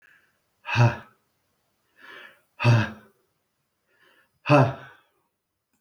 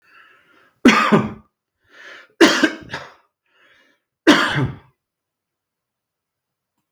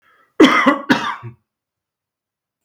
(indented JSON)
{
  "exhalation_length": "5.8 s",
  "exhalation_amplitude": 21804,
  "exhalation_signal_mean_std_ratio": 0.3,
  "three_cough_length": "6.9 s",
  "three_cough_amplitude": 32761,
  "three_cough_signal_mean_std_ratio": 0.32,
  "cough_length": "2.6 s",
  "cough_amplitude": 32761,
  "cough_signal_mean_std_ratio": 0.36,
  "survey_phase": "beta (2021-08-13 to 2022-03-07)",
  "age": "45-64",
  "gender": "Male",
  "wearing_mask": "No",
  "symptom_none": true,
  "smoker_status": "Never smoked",
  "respiratory_condition_asthma": false,
  "respiratory_condition_other": false,
  "recruitment_source": "REACT",
  "submission_delay": "1 day",
  "covid_test_result": "Negative",
  "covid_test_method": "RT-qPCR",
  "influenza_a_test_result": "Negative",
  "influenza_b_test_result": "Negative"
}